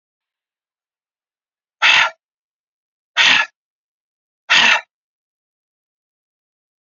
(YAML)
exhalation_length: 6.8 s
exhalation_amplitude: 32767
exhalation_signal_mean_std_ratio: 0.28
survey_phase: beta (2021-08-13 to 2022-03-07)
age: 45-64
gender: Female
wearing_mask: 'No'
symptom_cough_any: true
symptom_runny_or_blocked_nose: true
smoker_status: Never smoked
respiratory_condition_asthma: false
respiratory_condition_other: false
recruitment_source: Test and Trace
submission_delay: 1 day
covid_test_result: Negative
covid_test_method: LFT